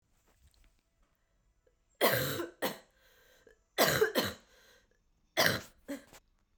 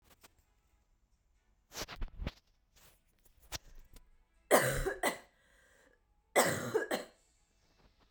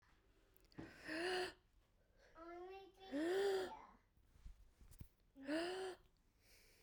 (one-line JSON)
{"cough_length": "6.6 s", "cough_amplitude": 12276, "cough_signal_mean_std_ratio": 0.35, "three_cough_length": "8.1 s", "three_cough_amplitude": 10036, "three_cough_signal_mean_std_ratio": 0.32, "exhalation_length": "6.8 s", "exhalation_amplitude": 957, "exhalation_signal_mean_std_ratio": 0.51, "survey_phase": "beta (2021-08-13 to 2022-03-07)", "age": "18-44", "gender": "Female", "wearing_mask": "No", "symptom_cough_any": true, "symptom_new_continuous_cough": true, "symptom_runny_or_blocked_nose": true, "symptom_fatigue": true, "symptom_fever_high_temperature": true, "symptom_headache": true, "symptom_onset": "4 days", "smoker_status": "Never smoked", "respiratory_condition_asthma": false, "respiratory_condition_other": false, "recruitment_source": "Test and Trace", "submission_delay": "2 days", "covid_test_result": "Positive", "covid_test_method": "RT-qPCR", "covid_ct_value": 14.1, "covid_ct_gene": "ORF1ab gene", "covid_ct_mean": 14.4, "covid_viral_load": "19000000 copies/ml", "covid_viral_load_category": "High viral load (>1M copies/ml)"}